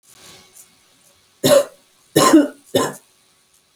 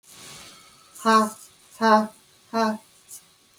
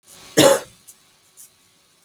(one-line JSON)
{"three_cough_length": "3.8 s", "three_cough_amplitude": 29792, "three_cough_signal_mean_std_ratio": 0.35, "exhalation_length": "3.6 s", "exhalation_amplitude": 19643, "exhalation_signal_mean_std_ratio": 0.39, "cough_length": "2.0 s", "cough_amplitude": 30130, "cough_signal_mean_std_ratio": 0.28, "survey_phase": "alpha (2021-03-01 to 2021-08-12)", "age": "45-64", "gender": "Female", "wearing_mask": "No", "symptom_none": true, "smoker_status": "Current smoker (1 to 10 cigarettes per day)", "respiratory_condition_asthma": false, "respiratory_condition_other": false, "recruitment_source": "REACT", "submission_delay": "9 days", "covid_test_result": "Negative", "covid_test_method": "RT-qPCR"}